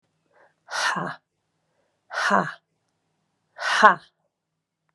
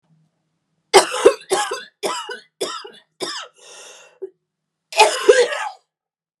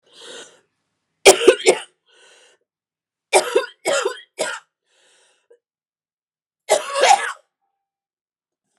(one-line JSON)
{"exhalation_length": "4.9 s", "exhalation_amplitude": 32768, "exhalation_signal_mean_std_ratio": 0.3, "cough_length": "6.4 s", "cough_amplitude": 32768, "cough_signal_mean_std_ratio": 0.35, "three_cough_length": "8.8 s", "three_cough_amplitude": 32768, "three_cough_signal_mean_std_ratio": 0.29, "survey_phase": "beta (2021-08-13 to 2022-03-07)", "age": "18-44", "gender": "Female", "wearing_mask": "No", "symptom_cough_any": true, "symptom_shortness_of_breath": true, "symptom_sore_throat": true, "symptom_diarrhoea": true, "symptom_fatigue": true, "symptom_headache": true, "symptom_change_to_sense_of_smell_or_taste": true, "symptom_loss_of_taste": true, "symptom_onset": "6 days", "smoker_status": "Never smoked", "respiratory_condition_asthma": false, "respiratory_condition_other": false, "recruitment_source": "Test and Trace", "submission_delay": "2 days", "covid_test_result": "Positive", "covid_test_method": "RT-qPCR"}